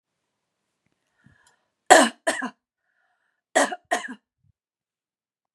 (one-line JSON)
{"cough_length": "5.5 s", "cough_amplitude": 32768, "cough_signal_mean_std_ratio": 0.22, "survey_phase": "beta (2021-08-13 to 2022-03-07)", "age": "45-64", "gender": "Female", "wearing_mask": "No", "symptom_none": true, "smoker_status": "Never smoked", "respiratory_condition_asthma": false, "respiratory_condition_other": false, "recruitment_source": "REACT", "submission_delay": "1 day", "covid_test_result": "Negative", "covid_test_method": "RT-qPCR", "influenza_a_test_result": "Unknown/Void", "influenza_b_test_result": "Unknown/Void"}